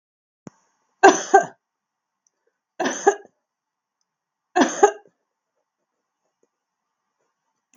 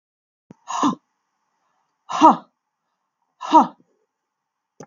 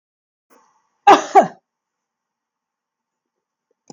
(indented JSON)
{
  "three_cough_length": "7.8 s",
  "three_cough_amplitude": 32767,
  "three_cough_signal_mean_std_ratio": 0.22,
  "exhalation_length": "4.9 s",
  "exhalation_amplitude": 32768,
  "exhalation_signal_mean_std_ratio": 0.25,
  "cough_length": "3.9 s",
  "cough_amplitude": 32768,
  "cough_signal_mean_std_ratio": 0.2,
  "survey_phase": "beta (2021-08-13 to 2022-03-07)",
  "age": "65+",
  "gender": "Female",
  "wearing_mask": "No",
  "symptom_none": true,
  "smoker_status": "Never smoked",
  "respiratory_condition_asthma": false,
  "respiratory_condition_other": false,
  "recruitment_source": "REACT",
  "submission_delay": "2 days",
  "covid_test_result": "Negative",
  "covid_test_method": "RT-qPCR",
  "influenza_a_test_result": "Negative",
  "influenza_b_test_result": "Negative"
}